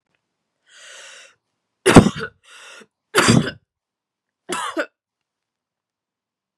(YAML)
three_cough_length: 6.6 s
three_cough_amplitude: 32768
three_cough_signal_mean_std_ratio: 0.25
survey_phase: beta (2021-08-13 to 2022-03-07)
age: 18-44
gender: Female
wearing_mask: 'No'
symptom_cough_any: true
symptom_runny_or_blocked_nose: true
symptom_shortness_of_breath: true
symptom_sore_throat: true
symptom_fatigue: true
symptom_fever_high_temperature: true
symptom_headache: true
smoker_status: Never smoked
respiratory_condition_asthma: false
respiratory_condition_other: false
recruitment_source: Test and Trace
submission_delay: 2 days
covid_test_result: Positive
covid_test_method: RT-qPCR
covid_ct_value: 24.3
covid_ct_gene: ORF1ab gene
covid_ct_mean: 24.4
covid_viral_load: 10000 copies/ml
covid_viral_load_category: Minimal viral load (< 10K copies/ml)